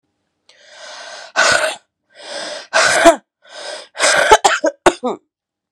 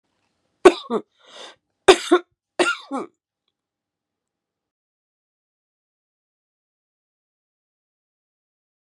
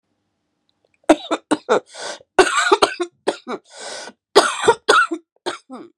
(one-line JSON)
{"exhalation_length": "5.7 s", "exhalation_amplitude": 32768, "exhalation_signal_mean_std_ratio": 0.45, "three_cough_length": "8.9 s", "three_cough_amplitude": 32767, "three_cough_signal_mean_std_ratio": 0.17, "cough_length": "6.0 s", "cough_amplitude": 32768, "cough_signal_mean_std_ratio": 0.4, "survey_phase": "beta (2021-08-13 to 2022-03-07)", "age": "18-44", "gender": "Female", "wearing_mask": "No", "symptom_cough_any": true, "symptom_new_continuous_cough": true, "symptom_runny_or_blocked_nose": true, "symptom_sore_throat": true, "symptom_fatigue": true, "symptom_headache": true, "symptom_change_to_sense_of_smell_or_taste": true, "symptom_onset": "6 days", "smoker_status": "Never smoked", "respiratory_condition_asthma": false, "respiratory_condition_other": false, "recruitment_source": "Test and Trace", "submission_delay": "0 days", "covid_test_result": "Positive", "covid_test_method": "RT-qPCR", "covid_ct_value": 26.5, "covid_ct_gene": "N gene"}